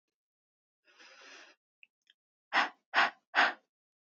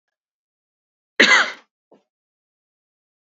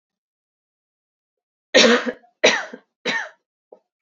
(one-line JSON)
{"exhalation_length": "4.2 s", "exhalation_amplitude": 7969, "exhalation_signal_mean_std_ratio": 0.27, "cough_length": "3.2 s", "cough_amplitude": 30089, "cough_signal_mean_std_ratio": 0.23, "three_cough_length": "4.0 s", "three_cough_amplitude": 30768, "three_cough_signal_mean_std_ratio": 0.31, "survey_phase": "beta (2021-08-13 to 2022-03-07)", "age": "18-44", "gender": "Female", "wearing_mask": "No", "symptom_runny_or_blocked_nose": true, "symptom_diarrhoea": true, "smoker_status": "Ex-smoker", "respiratory_condition_asthma": true, "respiratory_condition_other": false, "recruitment_source": "Test and Trace", "submission_delay": "1 day", "covid_test_result": "Positive", "covid_test_method": "RT-qPCR", "covid_ct_value": 33.0, "covid_ct_gene": "N gene"}